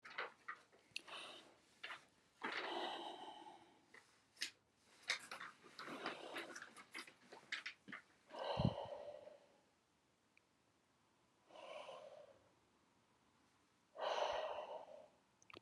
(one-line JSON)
{"exhalation_length": "15.6 s", "exhalation_amplitude": 2398, "exhalation_signal_mean_std_ratio": 0.48, "survey_phase": "alpha (2021-03-01 to 2021-08-12)", "age": "65+", "gender": "Female", "wearing_mask": "No", "symptom_none": true, "smoker_status": "Ex-smoker", "respiratory_condition_asthma": false, "respiratory_condition_other": false, "recruitment_source": "REACT", "submission_delay": "3 days", "covid_test_result": "Negative", "covid_test_method": "RT-qPCR"}